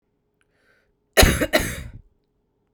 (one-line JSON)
{"cough_length": "2.7 s", "cough_amplitude": 32767, "cough_signal_mean_std_ratio": 0.31, "survey_phase": "beta (2021-08-13 to 2022-03-07)", "age": "18-44", "gender": "Female", "wearing_mask": "No", "symptom_cough_any": true, "symptom_runny_or_blocked_nose": true, "symptom_abdominal_pain": true, "symptom_headache": true, "symptom_loss_of_taste": true, "smoker_status": "Current smoker (1 to 10 cigarettes per day)", "respiratory_condition_asthma": false, "respiratory_condition_other": false, "recruitment_source": "Test and Trace", "submission_delay": "2 days", "covid_test_result": "Positive", "covid_test_method": "RT-qPCR", "covid_ct_value": 19.7, "covid_ct_gene": "ORF1ab gene", "covid_ct_mean": 20.4, "covid_viral_load": "200000 copies/ml", "covid_viral_load_category": "Low viral load (10K-1M copies/ml)"}